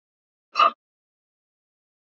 {"exhalation_length": "2.1 s", "exhalation_amplitude": 20220, "exhalation_signal_mean_std_ratio": 0.19, "survey_phase": "beta (2021-08-13 to 2022-03-07)", "age": "45-64", "gender": "Male", "wearing_mask": "No", "symptom_cough_any": true, "symptom_runny_or_blocked_nose": true, "symptom_shortness_of_breath": true, "symptom_sore_throat": true, "symptom_abdominal_pain": true, "symptom_diarrhoea": true, "symptom_fatigue": true, "symptom_change_to_sense_of_smell_or_taste": true, "symptom_onset": "12 days", "smoker_status": "Never smoked", "respiratory_condition_asthma": true, "respiratory_condition_other": false, "recruitment_source": "REACT", "submission_delay": "3 days", "covid_test_result": "Negative", "covid_test_method": "RT-qPCR"}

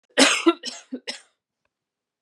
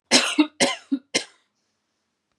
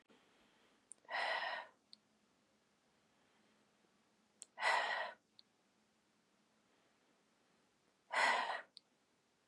{"three_cough_length": "2.2 s", "three_cough_amplitude": 30685, "three_cough_signal_mean_std_ratio": 0.33, "cough_length": "2.4 s", "cough_amplitude": 26910, "cough_signal_mean_std_ratio": 0.37, "exhalation_length": "9.5 s", "exhalation_amplitude": 2737, "exhalation_signal_mean_std_ratio": 0.33, "survey_phase": "beta (2021-08-13 to 2022-03-07)", "age": "18-44", "gender": "Female", "wearing_mask": "No", "symptom_none": true, "smoker_status": "Never smoked", "respiratory_condition_asthma": false, "respiratory_condition_other": false, "recruitment_source": "REACT", "submission_delay": "1 day", "covid_test_result": "Negative", "covid_test_method": "RT-qPCR"}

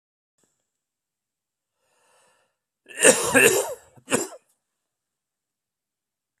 {"cough_length": "6.4 s", "cough_amplitude": 32731, "cough_signal_mean_std_ratio": 0.25, "survey_phase": "beta (2021-08-13 to 2022-03-07)", "age": "45-64", "gender": "Male", "wearing_mask": "No", "symptom_cough_any": true, "symptom_sore_throat": true, "symptom_fatigue": true, "symptom_fever_high_temperature": true, "symptom_headache": true, "symptom_onset": "4 days", "smoker_status": "Never smoked", "respiratory_condition_asthma": false, "respiratory_condition_other": false, "recruitment_source": "Test and Trace", "submission_delay": "1 day", "covid_test_result": "Positive", "covid_test_method": "RT-qPCR", "covid_ct_value": 23.8, "covid_ct_gene": "ORF1ab gene", "covid_ct_mean": 24.1, "covid_viral_load": "13000 copies/ml", "covid_viral_load_category": "Low viral load (10K-1M copies/ml)"}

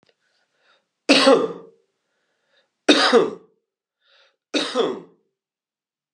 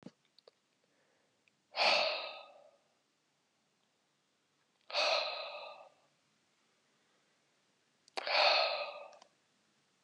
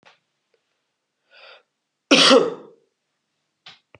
{"three_cough_length": "6.1 s", "three_cough_amplitude": 30036, "three_cough_signal_mean_std_ratio": 0.33, "exhalation_length": "10.0 s", "exhalation_amplitude": 5487, "exhalation_signal_mean_std_ratio": 0.34, "cough_length": "4.0 s", "cough_amplitude": 28005, "cough_signal_mean_std_ratio": 0.26, "survey_phase": "beta (2021-08-13 to 2022-03-07)", "age": "45-64", "gender": "Male", "wearing_mask": "No", "symptom_none": true, "smoker_status": "Never smoked", "respiratory_condition_asthma": false, "respiratory_condition_other": false, "recruitment_source": "REACT", "submission_delay": "1 day", "covid_test_result": "Negative", "covid_test_method": "RT-qPCR"}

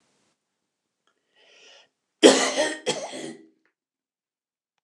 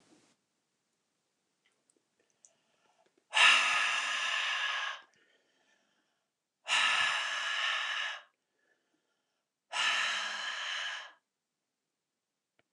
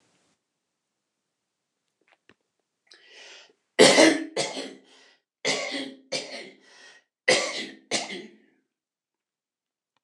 {"cough_length": "4.8 s", "cough_amplitude": 29094, "cough_signal_mean_std_ratio": 0.25, "exhalation_length": "12.7 s", "exhalation_amplitude": 9029, "exhalation_signal_mean_std_ratio": 0.45, "three_cough_length": "10.0 s", "three_cough_amplitude": 27145, "three_cough_signal_mean_std_ratio": 0.28, "survey_phase": "beta (2021-08-13 to 2022-03-07)", "age": "65+", "gender": "Male", "wearing_mask": "No", "symptom_none": true, "smoker_status": "Never smoked", "respiratory_condition_asthma": false, "respiratory_condition_other": false, "recruitment_source": "REACT", "submission_delay": "1 day", "covid_test_result": "Negative", "covid_test_method": "RT-qPCR"}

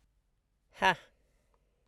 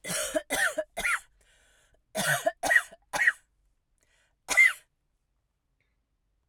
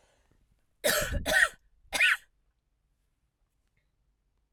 {"exhalation_length": "1.9 s", "exhalation_amplitude": 8882, "exhalation_signal_mean_std_ratio": 0.21, "three_cough_length": "6.5 s", "three_cough_amplitude": 10791, "three_cough_signal_mean_std_ratio": 0.38, "cough_length": "4.5 s", "cough_amplitude": 11178, "cough_signal_mean_std_ratio": 0.34, "survey_phase": "alpha (2021-03-01 to 2021-08-12)", "age": "45-64", "gender": "Female", "wearing_mask": "No", "symptom_none": true, "smoker_status": "Never smoked", "respiratory_condition_asthma": false, "respiratory_condition_other": false, "recruitment_source": "REACT", "submission_delay": "3 days", "covid_test_result": "Negative", "covid_test_method": "RT-qPCR"}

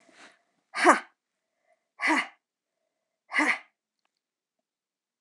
{"exhalation_length": "5.2 s", "exhalation_amplitude": 23160, "exhalation_signal_mean_std_ratio": 0.27, "survey_phase": "alpha (2021-03-01 to 2021-08-12)", "age": "65+", "gender": "Female", "wearing_mask": "No", "symptom_none": true, "smoker_status": "Never smoked", "respiratory_condition_asthma": false, "respiratory_condition_other": false, "recruitment_source": "REACT", "submission_delay": "1 day", "covid_test_result": "Negative", "covid_test_method": "RT-qPCR"}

